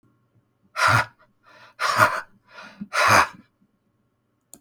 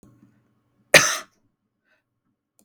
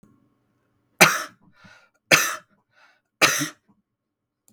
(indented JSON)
{
  "exhalation_length": "4.6 s",
  "exhalation_amplitude": 26842,
  "exhalation_signal_mean_std_ratio": 0.38,
  "cough_length": "2.6 s",
  "cough_amplitude": 32768,
  "cough_signal_mean_std_ratio": 0.19,
  "three_cough_length": "4.5 s",
  "three_cough_amplitude": 32768,
  "three_cough_signal_mean_std_ratio": 0.27,
  "survey_phase": "beta (2021-08-13 to 2022-03-07)",
  "age": "45-64",
  "gender": "Male",
  "wearing_mask": "No",
  "symptom_cough_any": true,
  "symptom_shortness_of_breath": true,
  "symptom_fatigue": true,
  "symptom_onset": "45 days",
  "smoker_status": "Never smoked",
  "respiratory_condition_asthma": false,
  "respiratory_condition_other": true,
  "recruitment_source": "Test and Trace",
  "submission_delay": "42 days",
  "covid_test_result": "Negative",
  "covid_test_method": "RT-qPCR"
}